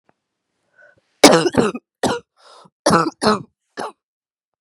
cough_length: 4.6 s
cough_amplitude: 32768
cough_signal_mean_std_ratio: 0.34
survey_phase: beta (2021-08-13 to 2022-03-07)
age: 18-44
gender: Female
wearing_mask: 'No'
symptom_cough_any: true
symptom_new_continuous_cough: true
symptom_sore_throat: true
symptom_fatigue: true
symptom_onset: 3 days
smoker_status: Never smoked
respiratory_condition_asthma: false
respiratory_condition_other: false
recruitment_source: Test and Trace
submission_delay: 2 days
covid_test_result: Positive
covid_test_method: RT-qPCR
covid_ct_value: 19.8
covid_ct_gene: ORF1ab gene
covid_ct_mean: 20.9
covid_viral_load: 140000 copies/ml
covid_viral_load_category: Low viral load (10K-1M copies/ml)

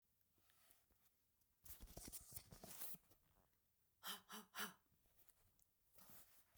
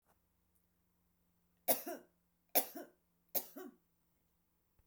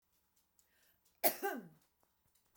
exhalation_length: 6.6 s
exhalation_amplitude: 525
exhalation_signal_mean_std_ratio: 0.45
three_cough_length: 4.9 s
three_cough_amplitude: 5352
three_cough_signal_mean_std_ratio: 0.23
cough_length: 2.6 s
cough_amplitude: 6927
cough_signal_mean_std_ratio: 0.24
survey_phase: beta (2021-08-13 to 2022-03-07)
age: 45-64
gender: Female
wearing_mask: 'No'
symptom_none: true
smoker_status: Never smoked
respiratory_condition_asthma: false
respiratory_condition_other: false
recruitment_source: REACT
submission_delay: 1 day
covid_test_result: Negative
covid_test_method: RT-qPCR
influenza_a_test_result: Negative
influenza_b_test_result: Negative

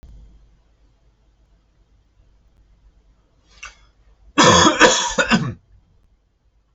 cough_length: 6.7 s
cough_amplitude: 30270
cough_signal_mean_std_ratio: 0.31
survey_phase: alpha (2021-03-01 to 2021-08-12)
age: 45-64
gender: Male
wearing_mask: 'No'
symptom_none: true
smoker_status: Never smoked
respiratory_condition_asthma: false
respiratory_condition_other: false
recruitment_source: REACT
submission_delay: 2 days
covid_test_result: Negative
covid_test_method: RT-qPCR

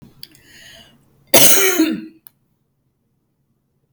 cough_length: 3.9 s
cough_amplitude: 32768
cough_signal_mean_std_ratio: 0.32
survey_phase: beta (2021-08-13 to 2022-03-07)
age: 65+
gender: Female
wearing_mask: 'No'
symptom_none: true
smoker_status: Never smoked
respiratory_condition_asthma: false
respiratory_condition_other: false
recruitment_source: REACT
submission_delay: 1 day
covid_test_result: Negative
covid_test_method: RT-qPCR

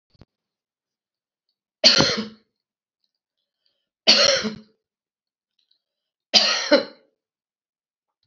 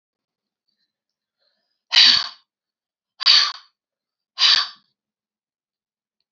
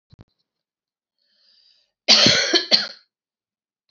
three_cough_length: 8.3 s
three_cough_amplitude: 32768
three_cough_signal_mean_std_ratio: 0.29
exhalation_length: 6.3 s
exhalation_amplitude: 31935
exhalation_signal_mean_std_ratio: 0.28
cough_length: 3.9 s
cough_amplitude: 29594
cough_signal_mean_std_ratio: 0.32
survey_phase: alpha (2021-03-01 to 2021-08-12)
age: 65+
gender: Female
wearing_mask: 'No'
symptom_none: true
smoker_status: Current smoker (1 to 10 cigarettes per day)
respiratory_condition_asthma: false
respiratory_condition_other: false
recruitment_source: REACT
submission_delay: 1 day
covid_test_result: Negative
covid_test_method: RT-qPCR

